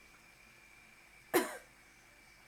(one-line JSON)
{"cough_length": "2.5 s", "cough_amplitude": 5019, "cough_signal_mean_std_ratio": 0.29, "survey_phase": "alpha (2021-03-01 to 2021-08-12)", "age": "18-44", "gender": "Female", "wearing_mask": "No", "symptom_none": true, "smoker_status": "Never smoked", "respiratory_condition_asthma": false, "respiratory_condition_other": false, "recruitment_source": "REACT", "submission_delay": "1 day", "covid_test_result": "Negative", "covid_test_method": "RT-qPCR"}